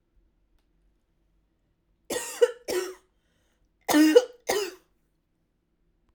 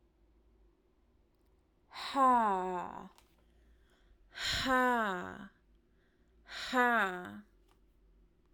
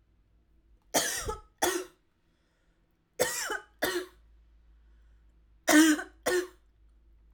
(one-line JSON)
{"cough_length": "6.1 s", "cough_amplitude": 22294, "cough_signal_mean_std_ratio": 0.29, "exhalation_length": "8.5 s", "exhalation_amplitude": 4275, "exhalation_signal_mean_std_ratio": 0.43, "three_cough_length": "7.3 s", "three_cough_amplitude": 11427, "three_cough_signal_mean_std_ratio": 0.36, "survey_phase": "alpha (2021-03-01 to 2021-08-12)", "age": "18-44", "gender": "Female", "wearing_mask": "No", "symptom_cough_any": true, "symptom_abdominal_pain": true, "symptom_diarrhoea": true, "symptom_onset": "13 days", "smoker_status": "Current smoker (e-cigarettes or vapes only)", "respiratory_condition_asthma": false, "respiratory_condition_other": false, "recruitment_source": "REACT", "submission_delay": "2 days", "covid_test_result": "Negative", "covid_test_method": "RT-qPCR"}